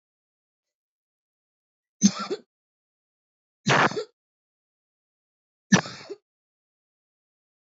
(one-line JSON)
{"three_cough_length": "7.7 s", "three_cough_amplitude": 24334, "three_cough_signal_mean_std_ratio": 0.21, "survey_phase": "alpha (2021-03-01 to 2021-08-12)", "age": "45-64", "gender": "Female", "wearing_mask": "No", "symptom_cough_any": true, "symptom_shortness_of_breath": true, "symptom_abdominal_pain": true, "symptom_diarrhoea": true, "symptom_fatigue": true, "symptom_headache": true, "symptom_change_to_sense_of_smell_or_taste": true, "smoker_status": "Ex-smoker", "respiratory_condition_asthma": false, "respiratory_condition_other": false, "recruitment_source": "Test and Trace", "submission_delay": "3 days", "covid_test_result": "Positive", "covid_test_method": "RT-qPCR", "covid_ct_value": 30.0, "covid_ct_gene": "ORF1ab gene", "covid_ct_mean": 31.0, "covid_viral_load": "70 copies/ml", "covid_viral_load_category": "Minimal viral load (< 10K copies/ml)"}